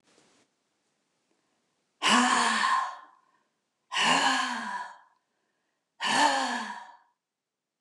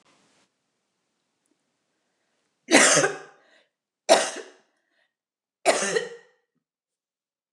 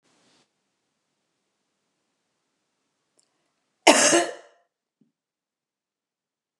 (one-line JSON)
{"exhalation_length": "7.8 s", "exhalation_amplitude": 11670, "exhalation_signal_mean_std_ratio": 0.47, "three_cough_length": "7.5 s", "three_cough_amplitude": 26802, "three_cough_signal_mean_std_ratio": 0.27, "cough_length": "6.6 s", "cough_amplitude": 29203, "cough_signal_mean_std_ratio": 0.19, "survey_phase": "beta (2021-08-13 to 2022-03-07)", "age": "65+", "gender": "Female", "wearing_mask": "No", "symptom_cough_any": true, "symptom_runny_or_blocked_nose": true, "smoker_status": "Ex-smoker", "respiratory_condition_asthma": false, "respiratory_condition_other": false, "recruitment_source": "REACT", "submission_delay": "1 day", "covid_test_result": "Negative", "covid_test_method": "RT-qPCR"}